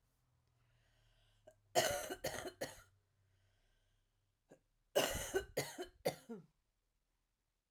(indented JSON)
{
  "cough_length": "7.7 s",
  "cough_amplitude": 3709,
  "cough_signal_mean_std_ratio": 0.33,
  "survey_phase": "beta (2021-08-13 to 2022-03-07)",
  "age": "45-64",
  "gender": "Female",
  "wearing_mask": "No",
  "symptom_none": true,
  "smoker_status": "Ex-smoker",
  "respiratory_condition_asthma": false,
  "respiratory_condition_other": false,
  "recruitment_source": "REACT",
  "submission_delay": "2 days",
  "covid_test_result": "Negative",
  "covid_test_method": "RT-qPCR"
}